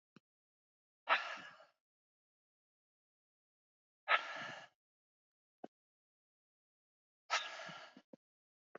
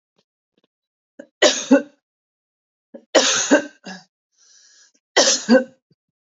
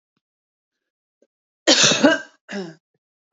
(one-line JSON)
{"exhalation_length": "8.8 s", "exhalation_amplitude": 4571, "exhalation_signal_mean_std_ratio": 0.23, "three_cough_length": "6.4 s", "three_cough_amplitude": 28629, "three_cough_signal_mean_std_ratio": 0.33, "cough_length": "3.3 s", "cough_amplitude": 29058, "cough_signal_mean_std_ratio": 0.32, "survey_phase": "beta (2021-08-13 to 2022-03-07)", "age": "45-64", "gender": "Female", "wearing_mask": "No", "symptom_runny_or_blocked_nose": true, "smoker_status": "Never smoked", "respiratory_condition_asthma": false, "respiratory_condition_other": false, "recruitment_source": "REACT", "submission_delay": "3 days", "covid_test_result": "Negative", "covid_test_method": "RT-qPCR", "influenza_a_test_result": "Unknown/Void", "influenza_b_test_result": "Unknown/Void"}